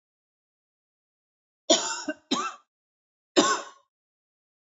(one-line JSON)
{"cough_length": "4.6 s", "cough_amplitude": 17264, "cough_signal_mean_std_ratio": 0.29, "survey_phase": "alpha (2021-03-01 to 2021-08-12)", "age": "18-44", "gender": "Female", "wearing_mask": "No", "symptom_cough_any": true, "symptom_fatigue": true, "symptom_change_to_sense_of_smell_or_taste": true, "symptom_loss_of_taste": true, "symptom_onset": "6 days", "smoker_status": "Never smoked", "respiratory_condition_asthma": false, "respiratory_condition_other": false, "recruitment_source": "Test and Trace", "submission_delay": "1 day", "covid_test_result": "Positive", "covid_test_method": "RT-qPCR", "covid_ct_value": 20.3, "covid_ct_gene": "N gene", "covid_ct_mean": 20.7, "covid_viral_load": "160000 copies/ml", "covid_viral_load_category": "Low viral load (10K-1M copies/ml)"}